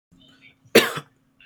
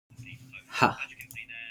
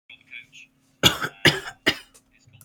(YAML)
cough_length: 1.5 s
cough_amplitude: 30648
cough_signal_mean_std_ratio: 0.25
exhalation_length: 1.7 s
exhalation_amplitude: 20190
exhalation_signal_mean_std_ratio: 0.37
three_cough_length: 2.6 s
three_cough_amplitude: 28510
three_cough_signal_mean_std_ratio: 0.3
survey_phase: beta (2021-08-13 to 2022-03-07)
age: 18-44
gender: Male
wearing_mask: 'No'
symptom_shortness_of_breath: true
symptom_abdominal_pain: true
smoker_status: Never smoked
respiratory_condition_asthma: false
respiratory_condition_other: false
recruitment_source: REACT
submission_delay: 1 day
covid_test_result: Negative
covid_test_method: RT-qPCR
influenza_a_test_result: Unknown/Void
influenza_b_test_result: Unknown/Void